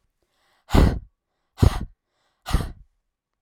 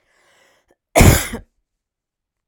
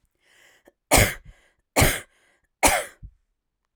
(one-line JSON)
{"exhalation_length": "3.4 s", "exhalation_amplitude": 30312, "exhalation_signal_mean_std_ratio": 0.29, "cough_length": "2.5 s", "cough_amplitude": 32768, "cough_signal_mean_std_ratio": 0.27, "three_cough_length": "3.8 s", "three_cough_amplitude": 30530, "three_cough_signal_mean_std_ratio": 0.32, "survey_phase": "alpha (2021-03-01 to 2021-08-12)", "age": "18-44", "gender": "Female", "wearing_mask": "No", "symptom_none": true, "smoker_status": "Never smoked", "respiratory_condition_asthma": false, "respiratory_condition_other": false, "recruitment_source": "REACT", "submission_delay": "1 day", "covid_test_result": "Negative", "covid_test_method": "RT-qPCR"}